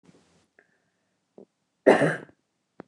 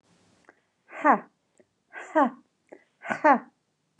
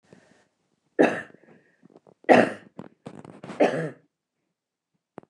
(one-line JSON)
{"cough_length": "2.9 s", "cough_amplitude": 24936, "cough_signal_mean_std_ratio": 0.23, "exhalation_length": "4.0 s", "exhalation_amplitude": 18179, "exhalation_signal_mean_std_ratio": 0.29, "three_cough_length": "5.3 s", "three_cough_amplitude": 28916, "three_cough_signal_mean_std_ratio": 0.27, "survey_phase": "beta (2021-08-13 to 2022-03-07)", "age": "45-64", "gender": "Female", "wearing_mask": "No", "symptom_runny_or_blocked_nose": true, "smoker_status": "Never smoked", "respiratory_condition_asthma": false, "respiratory_condition_other": false, "recruitment_source": "REACT", "submission_delay": "12 days", "covid_test_result": "Negative", "covid_test_method": "RT-qPCR", "influenza_a_test_result": "Negative", "influenza_b_test_result": "Negative"}